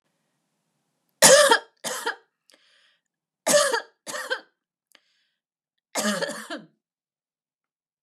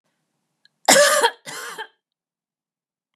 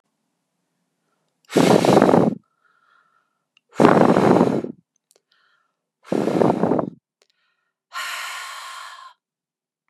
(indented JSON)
{
  "three_cough_length": "8.0 s",
  "three_cough_amplitude": 32768,
  "three_cough_signal_mean_std_ratio": 0.29,
  "cough_length": "3.2 s",
  "cough_amplitude": 31921,
  "cough_signal_mean_std_ratio": 0.32,
  "exhalation_length": "9.9 s",
  "exhalation_amplitude": 32768,
  "exhalation_signal_mean_std_ratio": 0.39,
  "survey_phase": "beta (2021-08-13 to 2022-03-07)",
  "age": "45-64",
  "gender": "Female",
  "wearing_mask": "No",
  "symptom_none": true,
  "smoker_status": "Never smoked",
  "respiratory_condition_asthma": false,
  "respiratory_condition_other": false,
  "recruitment_source": "REACT",
  "submission_delay": "1 day",
  "covid_test_result": "Negative",
  "covid_test_method": "RT-qPCR",
  "influenza_a_test_result": "Negative",
  "influenza_b_test_result": "Negative"
}